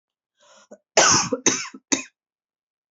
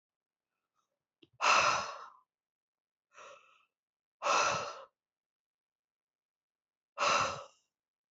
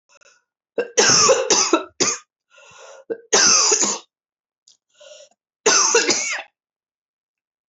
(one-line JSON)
{"cough_length": "2.9 s", "cough_amplitude": 25044, "cough_signal_mean_std_ratio": 0.35, "exhalation_length": "8.1 s", "exhalation_amplitude": 6196, "exhalation_signal_mean_std_ratio": 0.33, "three_cough_length": "7.7 s", "three_cough_amplitude": 25936, "three_cough_signal_mean_std_ratio": 0.47, "survey_phase": "beta (2021-08-13 to 2022-03-07)", "age": "45-64", "gender": "Female", "wearing_mask": "No", "symptom_cough_any": true, "symptom_runny_or_blocked_nose": true, "symptom_sore_throat": true, "symptom_headache": true, "symptom_change_to_sense_of_smell_or_taste": true, "symptom_loss_of_taste": true, "smoker_status": "Never smoked", "respiratory_condition_asthma": false, "respiratory_condition_other": false, "recruitment_source": "Test and Trace", "submission_delay": "2 days", "covid_test_result": "Positive", "covid_test_method": "RT-qPCR", "covid_ct_value": 16.4, "covid_ct_gene": "ORF1ab gene", "covid_ct_mean": 17.6, "covid_viral_load": "1700000 copies/ml", "covid_viral_load_category": "High viral load (>1M copies/ml)"}